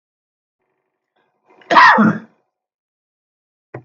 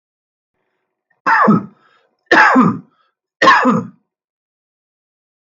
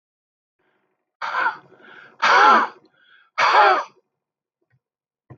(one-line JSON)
{"cough_length": "3.8 s", "cough_amplitude": 32768, "cough_signal_mean_std_ratio": 0.28, "three_cough_length": "5.5 s", "three_cough_amplitude": 32768, "three_cough_signal_mean_std_ratio": 0.4, "exhalation_length": "5.4 s", "exhalation_amplitude": 26325, "exhalation_signal_mean_std_ratio": 0.38, "survey_phase": "beta (2021-08-13 to 2022-03-07)", "age": "45-64", "gender": "Male", "wearing_mask": "No", "symptom_none": true, "smoker_status": "Ex-smoker", "respiratory_condition_asthma": false, "respiratory_condition_other": false, "recruitment_source": "REACT", "submission_delay": "1 day", "covid_test_result": "Negative", "covid_test_method": "RT-qPCR", "influenza_a_test_result": "Negative", "influenza_b_test_result": "Negative"}